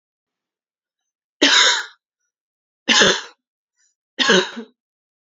{"three_cough_length": "5.4 s", "three_cough_amplitude": 32767, "three_cough_signal_mean_std_ratio": 0.35, "survey_phase": "beta (2021-08-13 to 2022-03-07)", "age": "18-44", "gender": "Female", "wearing_mask": "No", "symptom_cough_any": true, "symptom_new_continuous_cough": true, "symptom_runny_or_blocked_nose": true, "symptom_sore_throat": true, "symptom_fever_high_temperature": true, "symptom_headache": true, "symptom_other": true, "smoker_status": "Never smoked", "respiratory_condition_asthma": false, "respiratory_condition_other": false, "recruitment_source": "Test and Trace", "submission_delay": "1 day", "covid_test_result": "Positive", "covid_test_method": "LFT"}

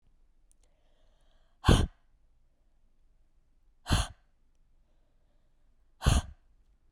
{"exhalation_length": "6.9 s", "exhalation_amplitude": 12819, "exhalation_signal_mean_std_ratio": 0.23, "survey_phase": "beta (2021-08-13 to 2022-03-07)", "age": "18-44", "gender": "Female", "wearing_mask": "No", "symptom_new_continuous_cough": true, "symptom_runny_or_blocked_nose": true, "symptom_fatigue": true, "symptom_headache": true, "symptom_other": true, "symptom_onset": "3 days", "smoker_status": "Never smoked", "respiratory_condition_asthma": false, "respiratory_condition_other": false, "recruitment_source": "Test and Trace", "submission_delay": "2 days", "covid_test_result": "Positive", "covid_test_method": "RT-qPCR", "covid_ct_value": 19.8, "covid_ct_gene": "N gene", "covid_ct_mean": 19.8, "covid_viral_load": "320000 copies/ml", "covid_viral_load_category": "Low viral load (10K-1M copies/ml)"}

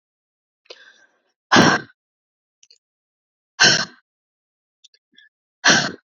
{"exhalation_length": "6.1 s", "exhalation_amplitude": 31431, "exhalation_signal_mean_std_ratio": 0.27, "survey_phase": "alpha (2021-03-01 to 2021-08-12)", "age": "18-44", "gender": "Female", "wearing_mask": "No", "symptom_none": true, "smoker_status": "Never smoked", "respiratory_condition_asthma": false, "respiratory_condition_other": false, "recruitment_source": "REACT", "submission_delay": "2 days", "covid_test_result": "Negative", "covid_test_method": "RT-qPCR"}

